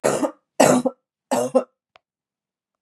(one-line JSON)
{"three_cough_length": "2.8 s", "three_cough_amplitude": 32711, "three_cough_signal_mean_std_ratio": 0.4, "survey_phase": "beta (2021-08-13 to 2022-03-07)", "age": "45-64", "gender": "Female", "wearing_mask": "No", "symptom_cough_any": true, "symptom_runny_or_blocked_nose": true, "smoker_status": "Never smoked", "respiratory_condition_asthma": false, "respiratory_condition_other": false, "recruitment_source": "Test and Trace", "submission_delay": "2 days", "covid_test_result": "Positive", "covid_test_method": "RT-qPCR", "covid_ct_value": 20.2, "covid_ct_gene": "N gene"}